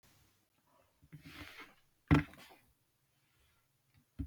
three_cough_length: 4.3 s
three_cough_amplitude: 6681
three_cough_signal_mean_std_ratio: 0.19
survey_phase: beta (2021-08-13 to 2022-03-07)
age: 45-64
gender: Female
wearing_mask: 'No'
symptom_cough_any: true
symptom_new_continuous_cough: true
symptom_runny_or_blocked_nose: true
symptom_fatigue: true
symptom_onset: 2 days
smoker_status: Never smoked
respiratory_condition_asthma: false
respiratory_condition_other: false
recruitment_source: Test and Trace
submission_delay: 0 days
covid_test_result: Positive
covid_test_method: ePCR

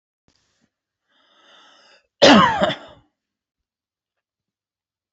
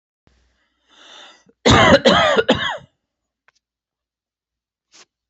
cough_length: 5.1 s
cough_amplitude: 28841
cough_signal_mean_std_ratio: 0.24
three_cough_length: 5.3 s
three_cough_amplitude: 30589
three_cough_signal_mean_std_ratio: 0.34
survey_phase: beta (2021-08-13 to 2022-03-07)
age: 45-64
gender: Male
wearing_mask: 'No'
symptom_none: true
smoker_status: Ex-smoker
respiratory_condition_asthma: false
respiratory_condition_other: false
recruitment_source: REACT
submission_delay: 7 days
covid_test_result: Negative
covid_test_method: RT-qPCR
influenza_a_test_result: Negative
influenza_b_test_result: Negative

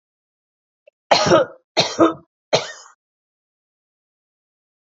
three_cough_length: 4.9 s
three_cough_amplitude: 29676
three_cough_signal_mean_std_ratio: 0.3
survey_phase: beta (2021-08-13 to 2022-03-07)
age: 45-64
gender: Female
wearing_mask: 'No'
symptom_cough_any: true
smoker_status: Never smoked
respiratory_condition_asthma: false
respiratory_condition_other: false
recruitment_source: REACT
submission_delay: 1 day
covid_test_result: Negative
covid_test_method: RT-qPCR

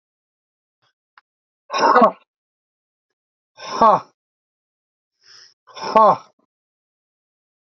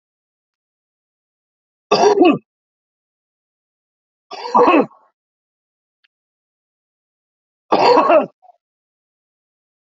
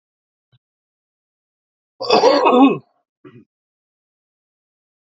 exhalation_length: 7.7 s
exhalation_amplitude: 28348
exhalation_signal_mean_std_ratio: 0.26
three_cough_length: 9.8 s
three_cough_amplitude: 30227
three_cough_signal_mean_std_ratio: 0.3
cough_length: 5.0 s
cough_amplitude: 32767
cough_signal_mean_std_ratio: 0.3
survey_phase: beta (2021-08-13 to 2022-03-07)
age: 65+
gender: Male
wearing_mask: 'No'
symptom_none: true
smoker_status: Current smoker (11 or more cigarettes per day)
recruitment_source: REACT
submission_delay: 5 days
covid_test_result: Negative
covid_test_method: RT-qPCR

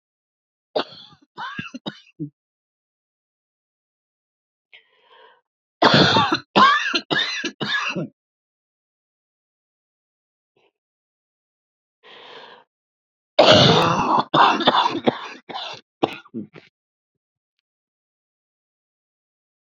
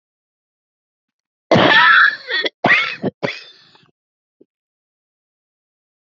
three_cough_length: 19.8 s
three_cough_amplitude: 31733
three_cough_signal_mean_std_ratio: 0.33
cough_length: 6.1 s
cough_amplitude: 29022
cough_signal_mean_std_ratio: 0.36
survey_phase: beta (2021-08-13 to 2022-03-07)
age: 45-64
gender: Female
wearing_mask: 'No'
symptom_none: true
symptom_onset: 5 days
smoker_status: Never smoked
respiratory_condition_asthma: true
respiratory_condition_other: false
recruitment_source: REACT
submission_delay: 5 days
covid_test_result: Negative
covid_test_method: RT-qPCR
influenza_a_test_result: Unknown/Void
influenza_b_test_result: Unknown/Void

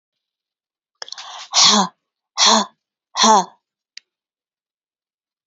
exhalation_length: 5.5 s
exhalation_amplitude: 32768
exhalation_signal_mean_std_ratio: 0.33
survey_phase: alpha (2021-03-01 to 2021-08-12)
age: 65+
gender: Female
wearing_mask: 'No'
symptom_none: true
smoker_status: Never smoked
respiratory_condition_asthma: false
respiratory_condition_other: false
recruitment_source: REACT
submission_delay: 1 day
covid_test_result: Negative
covid_test_method: RT-qPCR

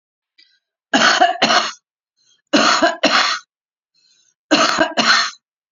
cough_length: 5.7 s
cough_amplitude: 32767
cough_signal_mean_std_ratio: 0.51
survey_phase: beta (2021-08-13 to 2022-03-07)
age: 45-64
gender: Female
wearing_mask: 'No'
symptom_none: true
smoker_status: Current smoker (e-cigarettes or vapes only)
respiratory_condition_asthma: false
respiratory_condition_other: false
recruitment_source: REACT
submission_delay: 4 days
covid_test_result: Negative
covid_test_method: RT-qPCR
influenza_a_test_result: Negative
influenza_b_test_result: Negative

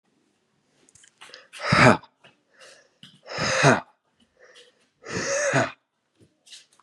exhalation_length: 6.8 s
exhalation_amplitude: 30315
exhalation_signal_mean_std_ratio: 0.33
survey_phase: beta (2021-08-13 to 2022-03-07)
age: 18-44
gender: Female
wearing_mask: 'No'
symptom_cough_any: true
symptom_runny_or_blocked_nose: true
symptom_fatigue: true
symptom_headache: true
symptom_onset: 3 days
smoker_status: Never smoked
respiratory_condition_asthma: false
respiratory_condition_other: false
recruitment_source: Test and Trace
submission_delay: 2 days
covid_test_result: Positive
covid_test_method: RT-qPCR
covid_ct_value: 28.0
covid_ct_gene: ORF1ab gene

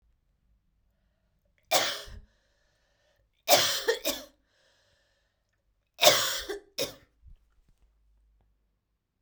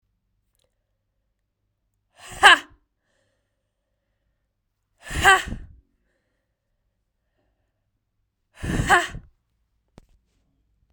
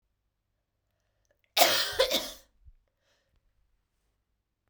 three_cough_length: 9.2 s
three_cough_amplitude: 25977
three_cough_signal_mean_std_ratio: 0.28
exhalation_length: 10.9 s
exhalation_amplitude: 32768
exhalation_signal_mean_std_ratio: 0.2
cough_length: 4.7 s
cough_amplitude: 16629
cough_signal_mean_std_ratio: 0.27
survey_phase: beta (2021-08-13 to 2022-03-07)
age: 18-44
gender: Female
wearing_mask: 'No'
symptom_cough_any: true
symptom_new_continuous_cough: true
symptom_runny_or_blocked_nose: true
symptom_change_to_sense_of_smell_or_taste: true
symptom_onset: 2 days
smoker_status: Ex-smoker
respiratory_condition_asthma: false
respiratory_condition_other: false
recruitment_source: Test and Trace
submission_delay: 1 day
covid_test_result: Positive
covid_test_method: RT-qPCR
covid_ct_value: 21.6
covid_ct_gene: S gene
covid_ct_mean: 22.0
covid_viral_load: 62000 copies/ml
covid_viral_load_category: Low viral load (10K-1M copies/ml)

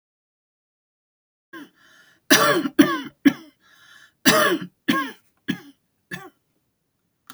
cough_length: 7.3 s
cough_amplitude: 32768
cough_signal_mean_std_ratio: 0.32
survey_phase: alpha (2021-03-01 to 2021-08-12)
age: 65+
gender: Female
wearing_mask: 'No'
symptom_none: true
smoker_status: Never smoked
respiratory_condition_asthma: false
respiratory_condition_other: false
recruitment_source: REACT
submission_delay: 1 day
covid_test_result: Negative
covid_test_method: RT-qPCR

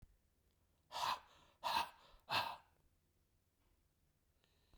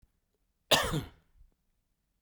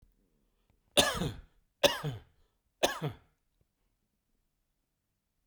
exhalation_length: 4.8 s
exhalation_amplitude: 1920
exhalation_signal_mean_std_ratio: 0.34
cough_length: 2.2 s
cough_amplitude: 12750
cough_signal_mean_std_ratio: 0.28
three_cough_length: 5.5 s
three_cough_amplitude: 12949
three_cough_signal_mean_std_ratio: 0.27
survey_phase: beta (2021-08-13 to 2022-03-07)
age: 65+
gender: Male
wearing_mask: 'No'
symptom_none: true
smoker_status: Never smoked
respiratory_condition_asthma: false
respiratory_condition_other: false
recruitment_source: REACT
submission_delay: 2 days
covid_test_result: Negative
covid_test_method: RT-qPCR
influenza_a_test_result: Negative
influenza_b_test_result: Negative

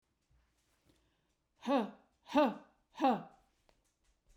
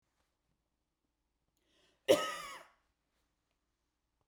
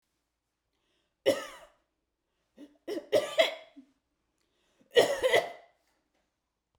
exhalation_length: 4.4 s
exhalation_amplitude: 4723
exhalation_signal_mean_std_ratio: 0.31
cough_length: 4.3 s
cough_amplitude: 7593
cough_signal_mean_std_ratio: 0.18
three_cough_length: 6.8 s
three_cough_amplitude: 11384
three_cough_signal_mean_std_ratio: 0.29
survey_phase: beta (2021-08-13 to 2022-03-07)
age: 45-64
gender: Female
wearing_mask: 'No'
symptom_runny_or_blocked_nose: true
smoker_status: Never smoked
respiratory_condition_asthma: false
respiratory_condition_other: false
recruitment_source: REACT
submission_delay: 1 day
covid_test_result: Negative
covid_test_method: RT-qPCR
influenza_a_test_result: Negative
influenza_b_test_result: Negative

